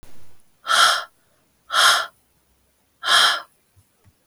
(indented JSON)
{
  "exhalation_length": "4.3 s",
  "exhalation_amplitude": 24075,
  "exhalation_signal_mean_std_ratio": 0.43,
  "survey_phase": "beta (2021-08-13 to 2022-03-07)",
  "age": "18-44",
  "gender": "Female",
  "wearing_mask": "No",
  "symptom_cough_any": true,
  "symptom_runny_or_blocked_nose": true,
  "symptom_fatigue": true,
  "symptom_headache": true,
  "symptom_onset": "3 days",
  "smoker_status": "Never smoked",
  "respiratory_condition_asthma": false,
  "respiratory_condition_other": false,
  "recruitment_source": "Test and Trace",
  "submission_delay": "2 days",
  "covid_test_result": "Positive",
  "covid_test_method": "RT-qPCR",
  "covid_ct_value": 24.4,
  "covid_ct_gene": "ORF1ab gene"
}